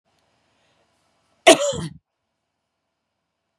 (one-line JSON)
{"cough_length": "3.6 s", "cough_amplitude": 32767, "cough_signal_mean_std_ratio": 0.19, "survey_phase": "beta (2021-08-13 to 2022-03-07)", "age": "45-64", "gender": "Female", "wearing_mask": "No", "symptom_none": true, "smoker_status": "Never smoked", "respiratory_condition_asthma": false, "respiratory_condition_other": false, "recruitment_source": "REACT", "submission_delay": "2 days", "covid_test_result": "Negative", "covid_test_method": "RT-qPCR", "influenza_a_test_result": "Negative", "influenza_b_test_result": "Negative"}